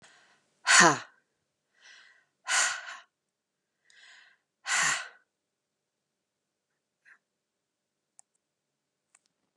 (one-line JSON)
{"exhalation_length": "9.6 s", "exhalation_amplitude": 17891, "exhalation_signal_mean_std_ratio": 0.23, "survey_phase": "beta (2021-08-13 to 2022-03-07)", "age": "45-64", "gender": "Female", "wearing_mask": "No", "symptom_none": true, "smoker_status": "Never smoked", "respiratory_condition_asthma": false, "respiratory_condition_other": false, "recruitment_source": "Test and Trace", "submission_delay": "1 day", "covid_test_result": "Negative", "covid_test_method": "RT-qPCR"}